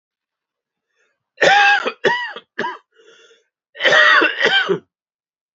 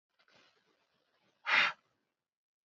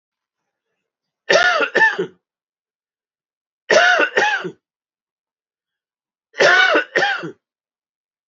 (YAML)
cough_length: 5.5 s
cough_amplitude: 28986
cough_signal_mean_std_ratio: 0.46
exhalation_length: 2.6 s
exhalation_amplitude: 6281
exhalation_signal_mean_std_ratio: 0.24
three_cough_length: 8.3 s
three_cough_amplitude: 32767
three_cough_signal_mean_std_ratio: 0.41
survey_phase: beta (2021-08-13 to 2022-03-07)
age: 45-64
gender: Male
wearing_mask: 'No'
symptom_cough_any: true
symptom_sore_throat: true
symptom_fatigue: true
smoker_status: Never smoked
respiratory_condition_asthma: false
respiratory_condition_other: false
recruitment_source: Test and Trace
submission_delay: 1 day
covid_test_result: Positive
covid_test_method: LFT